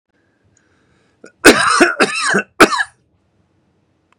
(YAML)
cough_length: 4.2 s
cough_amplitude: 32768
cough_signal_mean_std_ratio: 0.38
survey_phase: beta (2021-08-13 to 2022-03-07)
age: 45-64
gender: Male
wearing_mask: 'No'
symptom_none: true
smoker_status: Never smoked
respiratory_condition_asthma: false
respiratory_condition_other: false
recruitment_source: REACT
submission_delay: 2 days
covid_test_result: Negative
covid_test_method: RT-qPCR
influenza_a_test_result: Negative
influenza_b_test_result: Negative